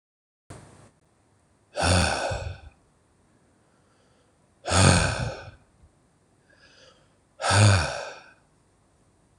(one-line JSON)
{"exhalation_length": "9.4 s", "exhalation_amplitude": 22070, "exhalation_signal_mean_std_ratio": 0.37, "survey_phase": "beta (2021-08-13 to 2022-03-07)", "age": "18-44", "gender": "Male", "wearing_mask": "No", "symptom_none": true, "smoker_status": "Never smoked", "respiratory_condition_asthma": false, "respiratory_condition_other": false, "recruitment_source": "REACT", "submission_delay": "6 days", "covid_test_result": "Negative", "covid_test_method": "RT-qPCR", "influenza_a_test_result": "Negative", "influenza_b_test_result": "Negative"}